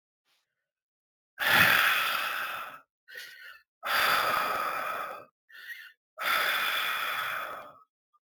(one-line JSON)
{"exhalation_length": "8.4 s", "exhalation_amplitude": 12976, "exhalation_signal_mean_std_ratio": 0.59, "survey_phase": "alpha (2021-03-01 to 2021-08-12)", "age": "45-64", "gender": "Male", "wearing_mask": "Yes", "symptom_fatigue": true, "symptom_headache": true, "symptom_change_to_sense_of_smell_or_taste": true, "smoker_status": "Never smoked", "respiratory_condition_asthma": true, "respiratory_condition_other": false, "recruitment_source": "Test and Trace", "submission_delay": "2 days", "covid_test_result": "Positive", "covid_test_method": "RT-qPCR", "covid_ct_value": 21.1, "covid_ct_gene": "ORF1ab gene"}